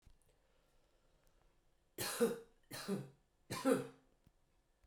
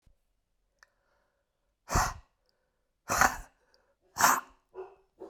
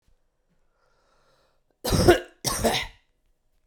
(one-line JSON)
{"three_cough_length": "4.9 s", "three_cough_amplitude": 2989, "three_cough_signal_mean_std_ratio": 0.34, "exhalation_length": "5.3 s", "exhalation_amplitude": 14894, "exhalation_signal_mean_std_ratio": 0.28, "cough_length": "3.7 s", "cough_amplitude": 23281, "cough_signal_mean_std_ratio": 0.32, "survey_phase": "beta (2021-08-13 to 2022-03-07)", "age": "18-44", "gender": "Female", "wearing_mask": "No", "symptom_cough_any": true, "symptom_runny_or_blocked_nose": true, "symptom_abdominal_pain": true, "symptom_fatigue": true, "symptom_fever_high_temperature": true, "symptom_onset": "2 days", "smoker_status": "Ex-smoker", "respiratory_condition_asthma": false, "respiratory_condition_other": false, "recruitment_source": "Test and Trace", "submission_delay": "1 day", "covid_test_result": "Positive", "covid_test_method": "RT-qPCR", "covid_ct_value": 19.4, "covid_ct_gene": "ORF1ab gene", "covid_ct_mean": 19.8, "covid_viral_load": "310000 copies/ml", "covid_viral_load_category": "Low viral load (10K-1M copies/ml)"}